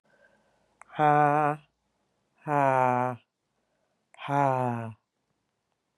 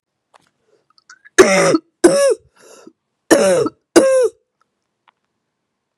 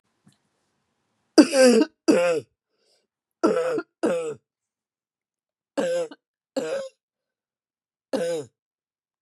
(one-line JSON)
{"exhalation_length": "6.0 s", "exhalation_amplitude": 12896, "exhalation_signal_mean_std_ratio": 0.39, "cough_length": "6.0 s", "cough_amplitude": 32768, "cough_signal_mean_std_ratio": 0.41, "three_cough_length": "9.2 s", "three_cough_amplitude": 30690, "three_cough_signal_mean_std_ratio": 0.36, "survey_phase": "beta (2021-08-13 to 2022-03-07)", "age": "18-44", "gender": "Female", "wearing_mask": "No", "symptom_cough_any": true, "symptom_new_continuous_cough": true, "symptom_runny_or_blocked_nose": true, "symptom_sore_throat": true, "symptom_fatigue": true, "symptom_fever_high_temperature": true, "symptom_change_to_sense_of_smell_or_taste": true, "symptom_loss_of_taste": true, "symptom_onset": "3 days", "smoker_status": "Current smoker (e-cigarettes or vapes only)", "respiratory_condition_asthma": false, "respiratory_condition_other": false, "recruitment_source": "Test and Trace", "submission_delay": "1 day", "covid_test_result": "Positive", "covid_test_method": "RT-qPCR", "covid_ct_value": 22.4, "covid_ct_gene": "ORF1ab gene", "covid_ct_mean": 22.8, "covid_viral_load": "34000 copies/ml", "covid_viral_load_category": "Low viral load (10K-1M copies/ml)"}